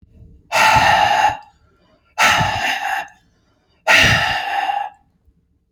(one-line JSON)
{"exhalation_length": "5.7 s", "exhalation_amplitude": 30336, "exhalation_signal_mean_std_ratio": 0.58, "survey_phase": "beta (2021-08-13 to 2022-03-07)", "age": "45-64", "gender": "Male", "wearing_mask": "No", "symptom_none": true, "smoker_status": "Never smoked", "respiratory_condition_asthma": false, "respiratory_condition_other": false, "recruitment_source": "REACT", "submission_delay": "1 day", "covid_test_result": "Negative", "covid_test_method": "RT-qPCR"}